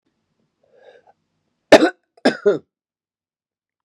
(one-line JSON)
{"cough_length": "3.8 s", "cough_amplitude": 32768, "cough_signal_mean_std_ratio": 0.22, "survey_phase": "beta (2021-08-13 to 2022-03-07)", "age": "45-64", "gender": "Male", "wearing_mask": "No", "symptom_none": true, "smoker_status": "Never smoked", "respiratory_condition_asthma": false, "respiratory_condition_other": false, "recruitment_source": "REACT", "submission_delay": "1 day", "covid_test_result": "Negative", "covid_test_method": "RT-qPCR"}